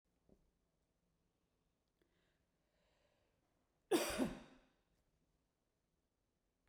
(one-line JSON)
{"cough_length": "6.7 s", "cough_amplitude": 2002, "cough_signal_mean_std_ratio": 0.21, "survey_phase": "beta (2021-08-13 to 2022-03-07)", "age": "45-64", "gender": "Female", "wearing_mask": "No", "symptom_none": true, "smoker_status": "Never smoked", "respiratory_condition_asthma": false, "respiratory_condition_other": false, "recruitment_source": "REACT", "submission_delay": "2 days", "covid_test_result": "Negative", "covid_test_method": "RT-qPCR"}